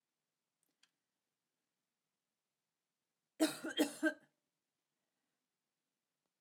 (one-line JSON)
{"cough_length": "6.4 s", "cough_amplitude": 3238, "cough_signal_mean_std_ratio": 0.2, "survey_phase": "alpha (2021-03-01 to 2021-08-12)", "age": "65+", "gender": "Female", "wearing_mask": "No", "symptom_none": true, "smoker_status": "Never smoked", "respiratory_condition_asthma": false, "respiratory_condition_other": false, "recruitment_source": "REACT", "submission_delay": "1 day", "covid_test_result": "Negative", "covid_test_method": "RT-qPCR"}